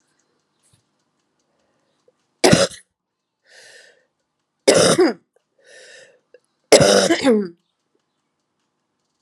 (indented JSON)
{
  "three_cough_length": "9.2 s",
  "three_cough_amplitude": 32768,
  "three_cough_signal_mean_std_ratio": 0.31,
  "survey_phase": "alpha (2021-03-01 to 2021-08-12)",
  "age": "45-64",
  "gender": "Female",
  "wearing_mask": "No",
  "symptom_cough_any": true,
  "symptom_shortness_of_breath": true,
  "symptom_abdominal_pain": true,
  "symptom_fatigue": true,
  "symptom_fever_high_temperature": true,
  "symptom_headache": true,
  "symptom_change_to_sense_of_smell_or_taste": true,
  "symptom_onset": "3 days",
  "smoker_status": "Never smoked",
  "respiratory_condition_asthma": false,
  "respiratory_condition_other": false,
  "recruitment_source": "Test and Trace",
  "submission_delay": "2 days",
  "covid_test_result": "Positive",
  "covid_test_method": "RT-qPCR",
  "covid_ct_value": 16.6,
  "covid_ct_gene": "ORF1ab gene",
  "covid_ct_mean": 16.9,
  "covid_viral_load": "2900000 copies/ml",
  "covid_viral_load_category": "High viral load (>1M copies/ml)"
}